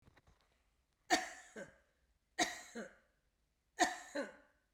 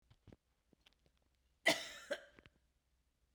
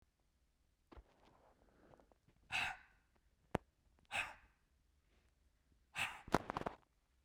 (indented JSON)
{
  "three_cough_length": "4.7 s",
  "three_cough_amplitude": 3966,
  "three_cough_signal_mean_std_ratio": 0.31,
  "cough_length": "3.3 s",
  "cough_amplitude": 3481,
  "cough_signal_mean_std_ratio": 0.22,
  "exhalation_length": "7.2 s",
  "exhalation_amplitude": 7345,
  "exhalation_signal_mean_std_ratio": 0.26,
  "survey_phase": "beta (2021-08-13 to 2022-03-07)",
  "age": "65+",
  "gender": "Female",
  "wearing_mask": "No",
  "symptom_none": true,
  "symptom_onset": "4 days",
  "smoker_status": "Ex-smoker",
  "respiratory_condition_asthma": false,
  "respiratory_condition_other": false,
  "recruitment_source": "REACT",
  "submission_delay": "4 days",
  "covid_test_result": "Negative",
  "covid_test_method": "RT-qPCR"
}